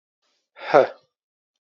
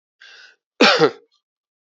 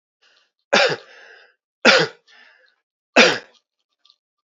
exhalation_length: 1.8 s
exhalation_amplitude: 26581
exhalation_signal_mean_std_ratio: 0.22
cough_length: 1.9 s
cough_amplitude: 32062
cough_signal_mean_std_ratio: 0.32
three_cough_length: 4.4 s
three_cough_amplitude: 31732
three_cough_signal_mean_std_ratio: 0.3
survey_phase: alpha (2021-03-01 to 2021-08-12)
age: 45-64
gender: Male
wearing_mask: 'No'
symptom_fatigue: true
symptom_headache: true
symptom_onset: 6 days
smoker_status: Never smoked
respiratory_condition_asthma: true
respiratory_condition_other: false
recruitment_source: Test and Trace
submission_delay: 2 days
covid_test_result: Positive
covid_test_method: RT-qPCR
covid_ct_value: 11.6
covid_ct_gene: N gene
covid_ct_mean: 11.8
covid_viral_load: 140000000 copies/ml
covid_viral_load_category: High viral load (>1M copies/ml)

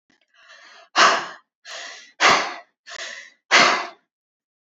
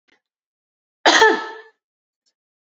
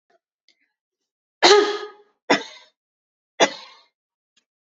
exhalation_length: 4.6 s
exhalation_amplitude: 28357
exhalation_signal_mean_std_ratio: 0.38
cough_length: 2.7 s
cough_amplitude: 30147
cough_signal_mean_std_ratio: 0.28
three_cough_length: 4.8 s
three_cough_amplitude: 30852
three_cough_signal_mean_std_ratio: 0.26
survey_phase: beta (2021-08-13 to 2022-03-07)
age: 45-64
gender: Female
wearing_mask: 'No'
symptom_none: true
smoker_status: Never smoked
respiratory_condition_asthma: false
respiratory_condition_other: false
recruitment_source: REACT
submission_delay: 1 day
covid_test_result: Negative
covid_test_method: RT-qPCR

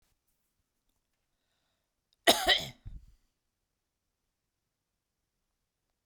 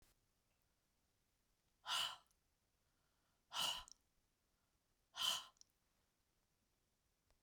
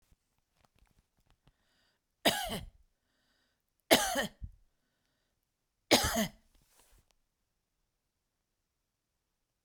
cough_length: 6.1 s
cough_amplitude: 15878
cough_signal_mean_std_ratio: 0.17
exhalation_length: 7.4 s
exhalation_amplitude: 1602
exhalation_signal_mean_std_ratio: 0.28
three_cough_length: 9.6 s
three_cough_amplitude: 21397
three_cough_signal_mean_std_ratio: 0.23
survey_phase: beta (2021-08-13 to 2022-03-07)
age: 65+
gender: Female
wearing_mask: 'No'
symptom_none: true
smoker_status: Never smoked
respiratory_condition_asthma: false
respiratory_condition_other: false
recruitment_source: REACT
submission_delay: 2 days
covid_test_result: Negative
covid_test_method: RT-qPCR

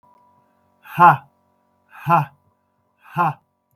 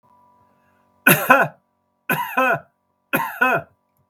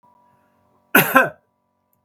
exhalation_length: 3.8 s
exhalation_amplitude: 30656
exhalation_signal_mean_std_ratio: 0.29
three_cough_length: 4.1 s
three_cough_amplitude: 32768
three_cough_signal_mean_std_ratio: 0.41
cough_length: 2.0 s
cough_amplitude: 32768
cough_signal_mean_std_ratio: 0.29
survey_phase: beta (2021-08-13 to 2022-03-07)
age: 65+
gender: Male
wearing_mask: 'No'
symptom_none: true
smoker_status: Ex-smoker
respiratory_condition_asthma: false
respiratory_condition_other: false
recruitment_source: REACT
submission_delay: 6 days
covid_test_result: Negative
covid_test_method: RT-qPCR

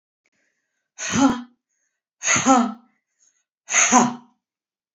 exhalation_length: 4.9 s
exhalation_amplitude: 31842
exhalation_signal_mean_std_ratio: 0.39
survey_phase: beta (2021-08-13 to 2022-03-07)
age: 45-64
gender: Female
wearing_mask: 'No'
symptom_none: true
smoker_status: Ex-smoker
respiratory_condition_asthma: false
respiratory_condition_other: false
recruitment_source: REACT
submission_delay: 3 days
covid_test_result: Negative
covid_test_method: RT-qPCR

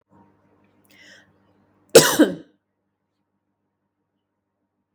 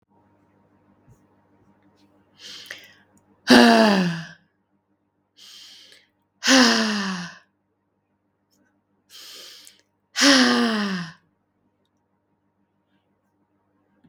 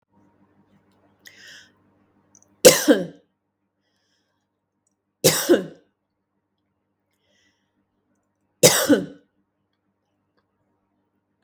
cough_length: 4.9 s
cough_amplitude: 32768
cough_signal_mean_std_ratio: 0.18
exhalation_length: 14.1 s
exhalation_amplitude: 32766
exhalation_signal_mean_std_ratio: 0.31
three_cough_length: 11.4 s
three_cough_amplitude: 32768
three_cough_signal_mean_std_ratio: 0.22
survey_phase: beta (2021-08-13 to 2022-03-07)
age: 18-44
gender: Female
wearing_mask: 'No'
symptom_none: true
smoker_status: Ex-smoker
respiratory_condition_asthma: false
respiratory_condition_other: false
recruitment_source: REACT
submission_delay: 2 days
covid_test_result: Negative
covid_test_method: RT-qPCR
influenza_a_test_result: Negative
influenza_b_test_result: Negative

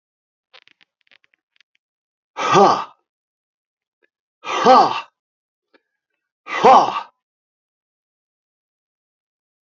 exhalation_length: 9.6 s
exhalation_amplitude: 28055
exhalation_signal_mean_std_ratio: 0.27
survey_phase: beta (2021-08-13 to 2022-03-07)
age: 65+
gender: Male
wearing_mask: 'No'
symptom_cough_any: true
smoker_status: Current smoker (1 to 10 cigarettes per day)
respiratory_condition_asthma: false
respiratory_condition_other: false
recruitment_source: REACT
submission_delay: 0 days
covid_test_result: Negative
covid_test_method: RT-qPCR
influenza_a_test_result: Negative
influenza_b_test_result: Negative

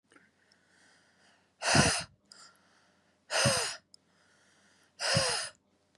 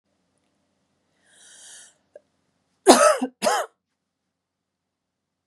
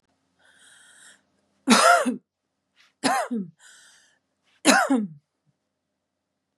exhalation_length: 6.0 s
exhalation_amplitude: 11211
exhalation_signal_mean_std_ratio: 0.37
cough_length: 5.5 s
cough_amplitude: 32768
cough_signal_mean_std_ratio: 0.23
three_cough_length: 6.6 s
three_cough_amplitude: 28575
three_cough_signal_mean_std_ratio: 0.34
survey_phase: beta (2021-08-13 to 2022-03-07)
age: 18-44
gender: Female
wearing_mask: 'No'
symptom_none: true
smoker_status: Ex-smoker
respiratory_condition_asthma: false
respiratory_condition_other: false
recruitment_source: REACT
submission_delay: 1 day
covid_test_result: Negative
covid_test_method: RT-qPCR
influenza_a_test_result: Negative
influenza_b_test_result: Negative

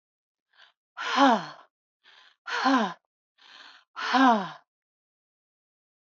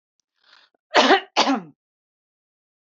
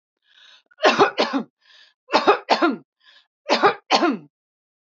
exhalation_length: 6.1 s
exhalation_amplitude: 14734
exhalation_signal_mean_std_ratio: 0.36
cough_length: 2.9 s
cough_amplitude: 28287
cough_signal_mean_std_ratio: 0.31
three_cough_length: 4.9 s
three_cough_amplitude: 27470
three_cough_signal_mean_std_ratio: 0.41
survey_phase: beta (2021-08-13 to 2022-03-07)
age: 45-64
gender: Female
wearing_mask: 'No'
symptom_none: true
smoker_status: Never smoked
respiratory_condition_asthma: false
respiratory_condition_other: false
recruitment_source: REACT
submission_delay: 2 days
covid_test_result: Negative
covid_test_method: RT-qPCR
influenza_a_test_result: Negative
influenza_b_test_result: Negative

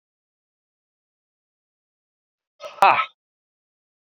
exhalation_length: 4.0 s
exhalation_amplitude: 27534
exhalation_signal_mean_std_ratio: 0.17
survey_phase: beta (2021-08-13 to 2022-03-07)
age: 45-64
gender: Male
wearing_mask: 'No'
symptom_cough_any: true
symptom_fever_high_temperature: true
symptom_change_to_sense_of_smell_or_taste: true
symptom_onset: 3 days
smoker_status: Ex-smoker
respiratory_condition_asthma: false
respiratory_condition_other: false
recruitment_source: Test and Trace
submission_delay: 1 day
covid_test_result: Positive
covid_test_method: RT-qPCR
covid_ct_value: 15.5
covid_ct_gene: ORF1ab gene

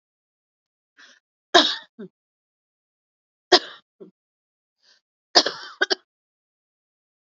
three_cough_length: 7.3 s
three_cough_amplitude: 32219
three_cough_signal_mean_std_ratio: 0.19
survey_phase: alpha (2021-03-01 to 2021-08-12)
age: 45-64
gender: Female
wearing_mask: 'No'
symptom_cough_any: true
symptom_shortness_of_breath: true
symptom_headache: true
symptom_loss_of_taste: true
symptom_onset: 4 days
smoker_status: Never smoked
respiratory_condition_asthma: false
respiratory_condition_other: false
recruitment_source: Test and Trace
submission_delay: 1 day
covid_test_result: Positive
covid_test_method: RT-qPCR
covid_ct_value: 20.0
covid_ct_gene: ORF1ab gene
covid_ct_mean: 20.6
covid_viral_load: 170000 copies/ml
covid_viral_load_category: Low viral load (10K-1M copies/ml)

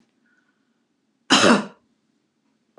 cough_length: 2.8 s
cough_amplitude: 26236
cough_signal_mean_std_ratio: 0.27
survey_phase: beta (2021-08-13 to 2022-03-07)
age: 65+
gender: Female
wearing_mask: 'No'
symptom_other: true
symptom_onset: 12 days
smoker_status: Never smoked
respiratory_condition_asthma: false
respiratory_condition_other: false
recruitment_source: REACT
submission_delay: 1 day
covid_test_result: Negative
covid_test_method: RT-qPCR
influenza_a_test_result: Negative
influenza_b_test_result: Negative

